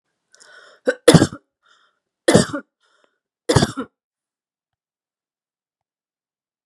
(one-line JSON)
{"three_cough_length": "6.7 s", "three_cough_amplitude": 32768, "three_cough_signal_mean_std_ratio": 0.22, "survey_phase": "beta (2021-08-13 to 2022-03-07)", "age": "18-44", "gender": "Female", "wearing_mask": "No", "symptom_none": true, "smoker_status": "Never smoked", "respiratory_condition_asthma": false, "respiratory_condition_other": false, "recruitment_source": "REACT", "submission_delay": "2 days", "covid_test_result": "Negative", "covid_test_method": "RT-qPCR", "influenza_a_test_result": "Negative", "influenza_b_test_result": "Negative"}